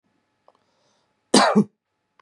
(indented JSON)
{
  "cough_length": "2.2 s",
  "cough_amplitude": 30189,
  "cough_signal_mean_std_ratio": 0.29,
  "survey_phase": "beta (2021-08-13 to 2022-03-07)",
  "age": "45-64",
  "gender": "Male",
  "wearing_mask": "No",
  "symptom_none": true,
  "smoker_status": "Never smoked",
  "respiratory_condition_asthma": false,
  "respiratory_condition_other": false,
  "recruitment_source": "REACT",
  "submission_delay": "1 day",
  "covid_test_result": "Negative",
  "covid_test_method": "RT-qPCR",
  "covid_ct_value": 38.0,
  "covid_ct_gene": "N gene",
  "influenza_a_test_result": "Negative",
  "influenza_b_test_result": "Negative"
}